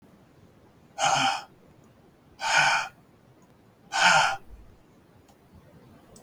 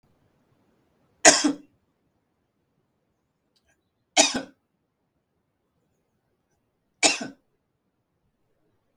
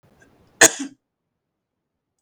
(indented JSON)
{
  "exhalation_length": "6.2 s",
  "exhalation_amplitude": 14781,
  "exhalation_signal_mean_std_ratio": 0.4,
  "three_cough_length": "9.0 s",
  "three_cough_amplitude": 32768,
  "three_cough_signal_mean_std_ratio": 0.19,
  "cough_length": "2.2 s",
  "cough_amplitude": 32768,
  "cough_signal_mean_std_ratio": 0.17,
  "survey_phase": "beta (2021-08-13 to 2022-03-07)",
  "age": "65+",
  "gender": "Male",
  "wearing_mask": "No",
  "symptom_cough_any": true,
  "symptom_runny_or_blocked_nose": true,
  "symptom_sore_throat": true,
  "symptom_headache": true,
  "smoker_status": "Never smoked",
  "respiratory_condition_asthma": false,
  "respiratory_condition_other": false,
  "recruitment_source": "Test and Trace",
  "submission_delay": "1 day",
  "covid_test_result": "Positive",
  "covid_test_method": "LFT"
}